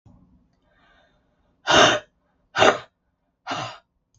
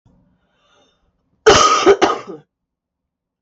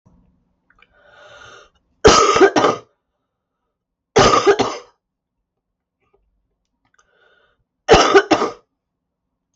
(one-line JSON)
{"exhalation_length": "4.2 s", "exhalation_amplitude": 32766, "exhalation_signal_mean_std_ratio": 0.3, "cough_length": "3.4 s", "cough_amplitude": 32768, "cough_signal_mean_std_ratio": 0.36, "three_cough_length": "9.6 s", "three_cough_amplitude": 32768, "three_cough_signal_mean_std_ratio": 0.33, "survey_phase": "beta (2021-08-13 to 2022-03-07)", "age": "45-64", "gender": "Female", "wearing_mask": "No", "symptom_cough_any": true, "symptom_runny_or_blocked_nose": true, "symptom_sore_throat": true, "symptom_diarrhoea": true, "symptom_fatigue": true, "symptom_fever_high_temperature": true, "symptom_headache": true, "symptom_change_to_sense_of_smell_or_taste": true, "symptom_loss_of_taste": true, "symptom_onset": "3 days", "smoker_status": "Never smoked", "respiratory_condition_asthma": false, "respiratory_condition_other": false, "recruitment_source": "Test and Trace", "submission_delay": "1 day", "covid_test_result": "Positive", "covid_test_method": "RT-qPCR"}